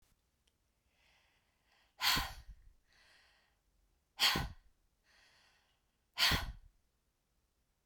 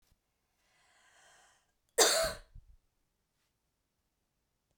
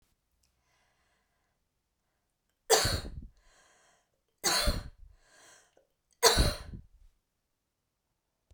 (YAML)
exhalation_length: 7.9 s
exhalation_amplitude: 4850
exhalation_signal_mean_std_ratio: 0.28
cough_length: 4.8 s
cough_amplitude: 9616
cough_signal_mean_std_ratio: 0.22
three_cough_length: 8.5 s
three_cough_amplitude: 14158
three_cough_signal_mean_std_ratio: 0.28
survey_phase: beta (2021-08-13 to 2022-03-07)
age: 45-64
gender: Female
wearing_mask: 'No'
symptom_none: true
smoker_status: Never smoked
respiratory_condition_asthma: false
respiratory_condition_other: false
recruitment_source: REACT
submission_delay: 2 days
covid_test_result: Negative
covid_test_method: RT-qPCR
influenza_a_test_result: Negative
influenza_b_test_result: Negative